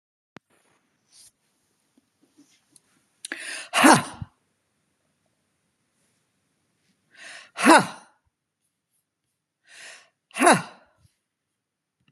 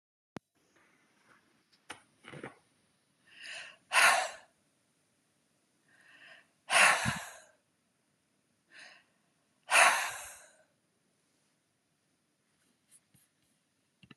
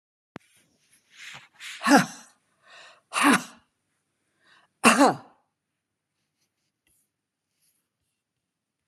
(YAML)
three_cough_length: 12.1 s
three_cough_amplitude: 32752
three_cough_signal_mean_std_ratio: 0.2
exhalation_length: 14.2 s
exhalation_amplitude: 10564
exhalation_signal_mean_std_ratio: 0.24
cough_length: 8.9 s
cough_amplitude: 26419
cough_signal_mean_std_ratio: 0.24
survey_phase: beta (2021-08-13 to 2022-03-07)
age: 65+
gender: Female
wearing_mask: 'No'
symptom_none: true
smoker_status: Never smoked
respiratory_condition_asthma: false
respiratory_condition_other: false
recruitment_source: REACT
submission_delay: 1 day
covid_test_result: Negative
covid_test_method: RT-qPCR